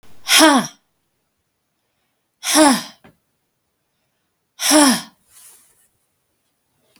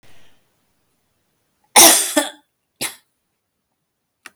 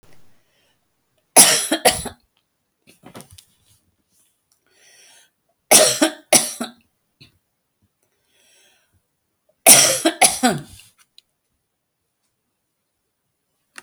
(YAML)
exhalation_length: 7.0 s
exhalation_amplitude: 32768
exhalation_signal_mean_std_ratio: 0.32
cough_length: 4.4 s
cough_amplitude: 32768
cough_signal_mean_std_ratio: 0.25
three_cough_length: 13.8 s
three_cough_amplitude: 32768
three_cough_signal_mean_std_ratio: 0.26
survey_phase: beta (2021-08-13 to 2022-03-07)
age: 65+
gender: Female
wearing_mask: 'No'
symptom_fatigue: true
symptom_onset: 12 days
smoker_status: Never smoked
respiratory_condition_asthma: false
respiratory_condition_other: false
recruitment_source: REACT
submission_delay: 2 days
covid_test_result: Negative
covid_test_method: RT-qPCR